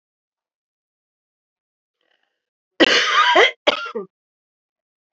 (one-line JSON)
{"cough_length": "5.1 s", "cough_amplitude": 32767, "cough_signal_mean_std_ratio": 0.32, "survey_phase": "beta (2021-08-13 to 2022-03-07)", "age": "65+", "gender": "Female", "wearing_mask": "No", "symptom_cough_any": true, "symptom_new_continuous_cough": true, "symptom_runny_or_blocked_nose": true, "symptom_shortness_of_breath": true, "symptom_sore_throat": true, "symptom_fatigue": true, "symptom_headache": true, "smoker_status": "Ex-smoker", "respiratory_condition_asthma": false, "respiratory_condition_other": false, "recruitment_source": "Test and Trace", "submission_delay": "1 day", "covid_test_result": "Positive", "covid_test_method": "RT-qPCR", "covid_ct_value": 15.8, "covid_ct_gene": "ORF1ab gene", "covid_ct_mean": 16.1, "covid_viral_load": "5200000 copies/ml", "covid_viral_load_category": "High viral load (>1M copies/ml)"}